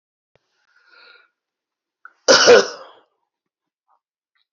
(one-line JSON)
{"cough_length": "4.5 s", "cough_amplitude": 32768, "cough_signal_mean_std_ratio": 0.23, "survey_phase": "beta (2021-08-13 to 2022-03-07)", "age": "65+", "gender": "Male", "wearing_mask": "No", "symptom_cough_any": true, "smoker_status": "Ex-smoker", "respiratory_condition_asthma": false, "respiratory_condition_other": true, "recruitment_source": "REACT", "submission_delay": "1 day", "covid_test_result": "Negative", "covid_test_method": "RT-qPCR", "influenza_a_test_result": "Negative", "influenza_b_test_result": "Negative"}